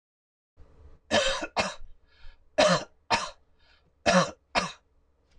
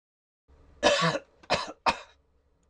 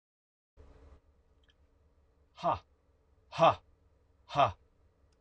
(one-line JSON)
{"three_cough_length": "5.4 s", "three_cough_amplitude": 11890, "three_cough_signal_mean_std_ratio": 0.39, "cough_length": "2.7 s", "cough_amplitude": 12914, "cough_signal_mean_std_ratio": 0.38, "exhalation_length": "5.2 s", "exhalation_amplitude": 8156, "exhalation_signal_mean_std_ratio": 0.24, "survey_phase": "beta (2021-08-13 to 2022-03-07)", "age": "45-64", "gender": "Male", "wearing_mask": "No", "symptom_none": true, "smoker_status": "Never smoked", "respiratory_condition_asthma": false, "respiratory_condition_other": false, "recruitment_source": "REACT", "submission_delay": "1 day", "covid_test_result": "Negative", "covid_test_method": "RT-qPCR", "influenza_a_test_result": "Negative", "influenza_b_test_result": "Negative"}